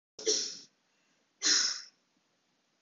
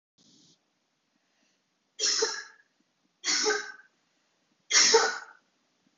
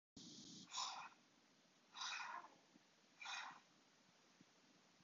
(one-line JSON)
{"cough_length": "2.8 s", "cough_amplitude": 6739, "cough_signal_mean_std_ratio": 0.38, "three_cough_length": "6.0 s", "three_cough_amplitude": 15504, "three_cough_signal_mean_std_ratio": 0.35, "exhalation_length": "5.0 s", "exhalation_amplitude": 641, "exhalation_signal_mean_std_ratio": 0.54, "survey_phase": "beta (2021-08-13 to 2022-03-07)", "age": "18-44", "gender": "Female", "wearing_mask": "No", "symptom_cough_any": true, "symptom_onset": "12 days", "smoker_status": "Never smoked", "respiratory_condition_asthma": false, "respiratory_condition_other": false, "recruitment_source": "REACT", "submission_delay": "2 days", "covid_test_result": "Negative", "covid_test_method": "RT-qPCR", "influenza_a_test_result": "Negative", "influenza_b_test_result": "Negative"}